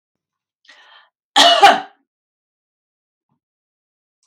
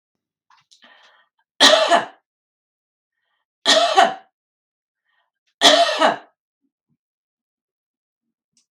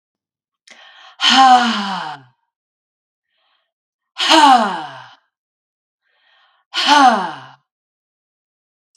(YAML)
cough_length: 4.3 s
cough_amplitude: 32768
cough_signal_mean_std_ratio: 0.25
three_cough_length: 8.7 s
three_cough_amplitude: 32768
three_cough_signal_mean_std_ratio: 0.31
exhalation_length: 9.0 s
exhalation_amplitude: 32768
exhalation_signal_mean_std_ratio: 0.37
survey_phase: beta (2021-08-13 to 2022-03-07)
age: 45-64
gender: Female
wearing_mask: 'No'
symptom_none: true
smoker_status: Never smoked
respiratory_condition_asthma: false
respiratory_condition_other: false
recruitment_source: REACT
submission_delay: 1 day
covid_test_result: Negative
covid_test_method: RT-qPCR
influenza_a_test_result: Negative
influenza_b_test_result: Negative